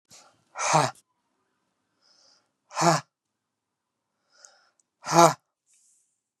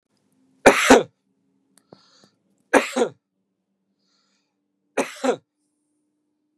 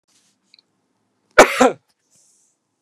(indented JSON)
{
  "exhalation_length": "6.4 s",
  "exhalation_amplitude": 27128,
  "exhalation_signal_mean_std_ratio": 0.24,
  "three_cough_length": "6.6 s",
  "three_cough_amplitude": 32768,
  "three_cough_signal_mean_std_ratio": 0.24,
  "cough_length": "2.8 s",
  "cough_amplitude": 32768,
  "cough_signal_mean_std_ratio": 0.22,
  "survey_phase": "beta (2021-08-13 to 2022-03-07)",
  "age": "45-64",
  "gender": "Male",
  "wearing_mask": "No",
  "symptom_fatigue": true,
  "smoker_status": "Never smoked",
  "respiratory_condition_asthma": false,
  "respiratory_condition_other": false,
  "recruitment_source": "REACT",
  "submission_delay": "3 days",
  "covid_test_result": "Negative",
  "covid_test_method": "RT-qPCR",
  "influenza_a_test_result": "Negative",
  "influenza_b_test_result": "Negative"
}